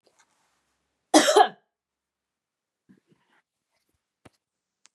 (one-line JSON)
{"cough_length": "4.9 s", "cough_amplitude": 25824, "cough_signal_mean_std_ratio": 0.19, "survey_phase": "beta (2021-08-13 to 2022-03-07)", "age": "45-64", "gender": "Female", "wearing_mask": "No", "symptom_none": true, "smoker_status": "Never smoked", "respiratory_condition_asthma": false, "respiratory_condition_other": false, "recruitment_source": "REACT", "submission_delay": "1 day", "covid_test_result": "Negative", "covid_test_method": "RT-qPCR", "influenza_a_test_result": "Negative", "influenza_b_test_result": "Negative"}